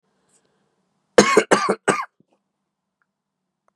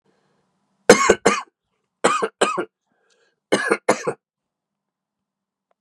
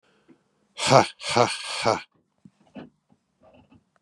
{"cough_length": "3.8 s", "cough_amplitude": 32768, "cough_signal_mean_std_ratio": 0.28, "three_cough_length": "5.8 s", "three_cough_amplitude": 32768, "three_cough_signal_mean_std_ratio": 0.31, "exhalation_length": "4.0 s", "exhalation_amplitude": 30177, "exhalation_signal_mean_std_ratio": 0.31, "survey_phase": "beta (2021-08-13 to 2022-03-07)", "age": "18-44", "gender": "Male", "wearing_mask": "No", "symptom_cough_any": true, "symptom_runny_or_blocked_nose": true, "symptom_sore_throat": true, "symptom_fatigue": true, "symptom_headache": true, "smoker_status": "Never smoked", "respiratory_condition_asthma": true, "respiratory_condition_other": false, "recruitment_source": "Test and Trace", "submission_delay": "0 days", "covid_test_result": "Positive", "covid_test_method": "RT-qPCR", "covid_ct_value": 18.8, "covid_ct_gene": "N gene"}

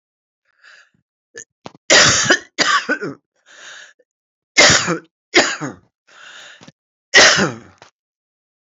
{"three_cough_length": "8.6 s", "three_cough_amplitude": 32768, "three_cough_signal_mean_std_ratio": 0.37, "survey_phase": "beta (2021-08-13 to 2022-03-07)", "age": "65+", "gender": "Female", "wearing_mask": "No", "symptom_cough_any": true, "symptom_runny_or_blocked_nose": true, "smoker_status": "Current smoker (e-cigarettes or vapes only)", "respiratory_condition_asthma": false, "respiratory_condition_other": false, "recruitment_source": "Test and Trace", "submission_delay": "1 day", "covid_test_result": "Positive", "covid_test_method": "LFT"}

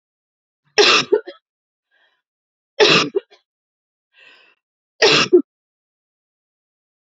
{"three_cough_length": "7.2 s", "three_cough_amplitude": 30123, "three_cough_signal_mean_std_ratio": 0.3, "survey_phase": "beta (2021-08-13 to 2022-03-07)", "age": "18-44", "gender": "Female", "wearing_mask": "No", "symptom_sore_throat": true, "symptom_headache": true, "symptom_onset": "2 days", "smoker_status": "Never smoked", "respiratory_condition_asthma": false, "respiratory_condition_other": false, "recruitment_source": "Test and Trace", "submission_delay": "1 day", "covid_test_result": "Negative", "covid_test_method": "ePCR"}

